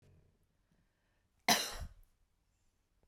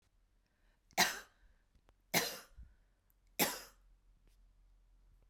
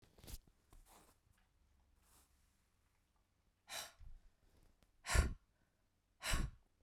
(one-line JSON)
{"cough_length": "3.1 s", "cough_amplitude": 6538, "cough_signal_mean_std_ratio": 0.23, "three_cough_length": "5.3 s", "three_cough_amplitude": 5228, "three_cough_signal_mean_std_ratio": 0.27, "exhalation_length": "6.8 s", "exhalation_amplitude": 3666, "exhalation_signal_mean_std_ratio": 0.26, "survey_phase": "beta (2021-08-13 to 2022-03-07)", "age": "45-64", "gender": "Female", "wearing_mask": "No", "symptom_none": true, "smoker_status": "Never smoked", "respiratory_condition_asthma": false, "respiratory_condition_other": false, "recruitment_source": "REACT", "submission_delay": "2 days", "covid_test_result": "Negative", "covid_test_method": "RT-qPCR", "influenza_a_test_result": "Negative", "influenza_b_test_result": "Negative"}